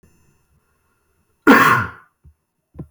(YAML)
cough_length: 2.9 s
cough_amplitude: 29612
cough_signal_mean_std_ratio: 0.3
survey_phase: beta (2021-08-13 to 2022-03-07)
age: 18-44
gender: Male
wearing_mask: 'No'
symptom_none: true
smoker_status: Never smoked
respiratory_condition_asthma: false
respiratory_condition_other: false
recruitment_source: REACT
submission_delay: 3 days
covid_test_result: Negative
covid_test_method: RT-qPCR